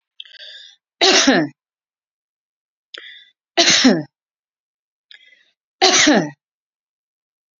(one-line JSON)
{"cough_length": "7.6 s", "cough_amplitude": 32768, "cough_signal_mean_std_ratio": 0.35, "survey_phase": "beta (2021-08-13 to 2022-03-07)", "age": "65+", "gender": "Female", "wearing_mask": "No", "symptom_none": true, "smoker_status": "Ex-smoker", "respiratory_condition_asthma": true, "respiratory_condition_other": false, "recruitment_source": "REACT", "submission_delay": "2 days", "covid_test_result": "Negative", "covid_test_method": "RT-qPCR", "influenza_a_test_result": "Negative", "influenza_b_test_result": "Negative"}